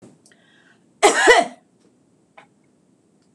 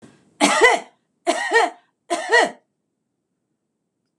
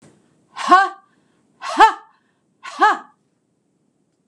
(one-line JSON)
{"cough_length": "3.3 s", "cough_amplitude": 26028, "cough_signal_mean_std_ratio": 0.28, "three_cough_length": "4.2 s", "three_cough_amplitude": 26027, "three_cough_signal_mean_std_ratio": 0.4, "exhalation_length": "4.3 s", "exhalation_amplitude": 26028, "exhalation_signal_mean_std_ratio": 0.31, "survey_phase": "beta (2021-08-13 to 2022-03-07)", "age": "65+", "gender": "Female", "wearing_mask": "No", "symptom_none": true, "smoker_status": "Never smoked", "respiratory_condition_asthma": false, "respiratory_condition_other": false, "recruitment_source": "REACT", "submission_delay": "2 days", "covid_test_result": "Negative", "covid_test_method": "RT-qPCR", "influenza_a_test_result": "Unknown/Void", "influenza_b_test_result": "Unknown/Void"}